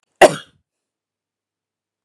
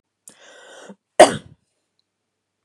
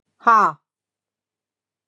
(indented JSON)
{
  "cough_length": "2.0 s",
  "cough_amplitude": 32768,
  "cough_signal_mean_std_ratio": 0.17,
  "three_cough_length": "2.6 s",
  "three_cough_amplitude": 32768,
  "three_cough_signal_mean_std_ratio": 0.17,
  "exhalation_length": "1.9 s",
  "exhalation_amplitude": 25773,
  "exhalation_signal_mean_std_ratio": 0.29,
  "survey_phase": "beta (2021-08-13 to 2022-03-07)",
  "age": "45-64",
  "gender": "Female",
  "wearing_mask": "No",
  "symptom_none": true,
  "smoker_status": "Never smoked",
  "respiratory_condition_asthma": false,
  "respiratory_condition_other": false,
  "recruitment_source": "REACT",
  "submission_delay": "7 days",
  "covid_test_result": "Negative",
  "covid_test_method": "RT-qPCR",
  "influenza_a_test_result": "Negative",
  "influenza_b_test_result": "Negative"
}